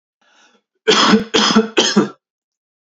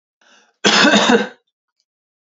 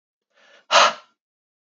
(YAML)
three_cough_length: 3.0 s
three_cough_amplitude: 31290
three_cough_signal_mean_std_ratio: 0.48
cough_length: 2.4 s
cough_amplitude: 30657
cough_signal_mean_std_ratio: 0.43
exhalation_length: 1.8 s
exhalation_amplitude: 26701
exhalation_signal_mean_std_ratio: 0.27
survey_phase: beta (2021-08-13 to 2022-03-07)
age: 18-44
gender: Male
wearing_mask: 'No'
symptom_none: true
smoker_status: Never smoked
respiratory_condition_asthma: false
respiratory_condition_other: false
recruitment_source: REACT
submission_delay: 3 days
covid_test_result: Negative
covid_test_method: RT-qPCR
influenza_a_test_result: Negative
influenza_b_test_result: Negative